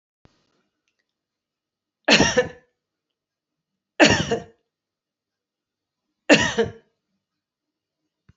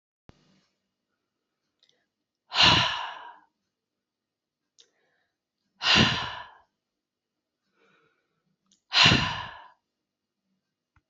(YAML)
three_cough_length: 8.4 s
three_cough_amplitude: 31063
three_cough_signal_mean_std_ratio: 0.26
exhalation_length: 11.1 s
exhalation_amplitude: 19515
exhalation_signal_mean_std_ratio: 0.27
survey_phase: alpha (2021-03-01 to 2021-08-12)
age: 65+
gender: Female
wearing_mask: 'No'
symptom_none: true
smoker_status: Ex-smoker
respiratory_condition_asthma: false
respiratory_condition_other: false
recruitment_source: REACT
submission_delay: 1 day
covid_test_result: Negative
covid_test_method: RT-qPCR